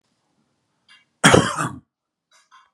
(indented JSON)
{
  "cough_length": "2.7 s",
  "cough_amplitude": 32767,
  "cough_signal_mean_std_ratio": 0.27,
  "survey_phase": "beta (2021-08-13 to 2022-03-07)",
  "age": "65+",
  "gender": "Male",
  "wearing_mask": "No",
  "symptom_none": true,
  "smoker_status": "Never smoked",
  "respiratory_condition_asthma": false,
  "respiratory_condition_other": false,
  "recruitment_source": "REACT",
  "submission_delay": "2 days",
  "covid_test_result": "Negative",
  "covid_test_method": "RT-qPCR"
}